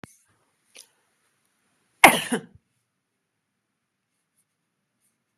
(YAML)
cough_length: 5.4 s
cough_amplitude: 32768
cough_signal_mean_std_ratio: 0.14
survey_phase: beta (2021-08-13 to 2022-03-07)
age: 45-64
gender: Female
wearing_mask: 'No'
symptom_none: true
smoker_status: Never smoked
respiratory_condition_asthma: false
respiratory_condition_other: false
recruitment_source: REACT
submission_delay: 1 day
covid_test_result: Negative
covid_test_method: RT-qPCR
influenza_a_test_result: Unknown/Void
influenza_b_test_result: Unknown/Void